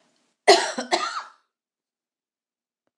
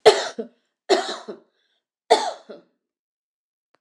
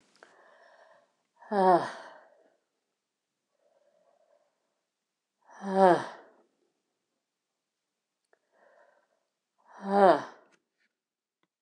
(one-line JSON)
{"cough_length": "3.0 s", "cough_amplitude": 26027, "cough_signal_mean_std_ratio": 0.27, "three_cough_length": "3.8 s", "three_cough_amplitude": 26028, "three_cough_signal_mean_std_ratio": 0.28, "exhalation_length": "11.6 s", "exhalation_amplitude": 13235, "exhalation_signal_mean_std_ratio": 0.22, "survey_phase": "alpha (2021-03-01 to 2021-08-12)", "age": "65+", "gender": "Female", "wearing_mask": "No", "symptom_none": true, "smoker_status": "Never smoked", "respiratory_condition_asthma": false, "respiratory_condition_other": false, "recruitment_source": "REACT", "submission_delay": "2 days", "covid_test_method": "RT-qPCR", "covid_ct_value": 38.0, "covid_ct_gene": "N gene"}